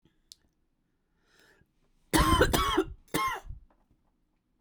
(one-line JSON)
{"three_cough_length": "4.6 s", "three_cough_amplitude": 10598, "three_cough_signal_mean_std_ratio": 0.37, "survey_phase": "beta (2021-08-13 to 2022-03-07)", "age": "45-64", "gender": "Female", "wearing_mask": "No", "symptom_cough_any": true, "symptom_runny_or_blocked_nose": true, "symptom_shortness_of_breath": true, "symptom_sore_throat": true, "symptom_fatigue": true, "symptom_headache": true, "symptom_change_to_sense_of_smell_or_taste": true, "symptom_loss_of_taste": true, "symptom_other": true, "symptom_onset": "5 days", "smoker_status": "Never smoked", "respiratory_condition_asthma": false, "respiratory_condition_other": false, "recruitment_source": "Test and Trace", "submission_delay": "2 days", "covid_test_result": "Positive", "covid_test_method": "RT-qPCR", "covid_ct_value": 19.9, "covid_ct_gene": "ORF1ab gene", "covid_ct_mean": 20.0, "covid_viral_load": "270000 copies/ml", "covid_viral_load_category": "Low viral load (10K-1M copies/ml)"}